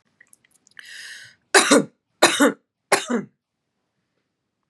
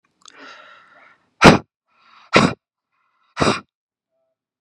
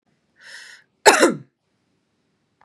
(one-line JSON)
{"three_cough_length": "4.7 s", "three_cough_amplitude": 32738, "three_cough_signal_mean_std_ratio": 0.31, "exhalation_length": "4.6 s", "exhalation_amplitude": 32768, "exhalation_signal_mean_std_ratio": 0.24, "cough_length": "2.6 s", "cough_amplitude": 32768, "cough_signal_mean_std_ratio": 0.25, "survey_phase": "beta (2021-08-13 to 2022-03-07)", "age": "18-44", "gender": "Female", "wearing_mask": "No", "symptom_none": true, "smoker_status": "Never smoked", "respiratory_condition_asthma": false, "respiratory_condition_other": false, "recruitment_source": "REACT", "submission_delay": "1 day", "covid_test_result": "Negative", "covid_test_method": "RT-qPCR", "influenza_a_test_result": "Unknown/Void", "influenza_b_test_result": "Unknown/Void"}